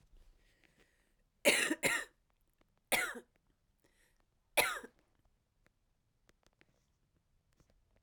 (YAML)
three_cough_length: 8.0 s
three_cough_amplitude: 7282
three_cough_signal_mean_std_ratio: 0.26
survey_phase: beta (2021-08-13 to 2022-03-07)
age: 45-64
gender: Female
wearing_mask: 'No'
symptom_cough_any: true
symptom_runny_or_blocked_nose: true
symptom_onset: 3 days
smoker_status: Never smoked
respiratory_condition_asthma: true
respiratory_condition_other: false
recruitment_source: Test and Trace
submission_delay: 2 days
covid_test_result: Positive
covid_test_method: RT-qPCR